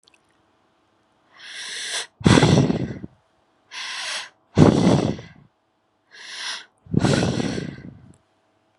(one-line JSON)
{"exhalation_length": "8.8 s", "exhalation_amplitude": 32768, "exhalation_signal_mean_std_ratio": 0.41, "survey_phase": "beta (2021-08-13 to 2022-03-07)", "age": "18-44", "gender": "Female", "wearing_mask": "No", "symptom_none": true, "smoker_status": "Never smoked", "respiratory_condition_asthma": false, "respiratory_condition_other": false, "recruitment_source": "REACT", "submission_delay": "1 day", "covid_test_result": "Negative", "covid_test_method": "RT-qPCR"}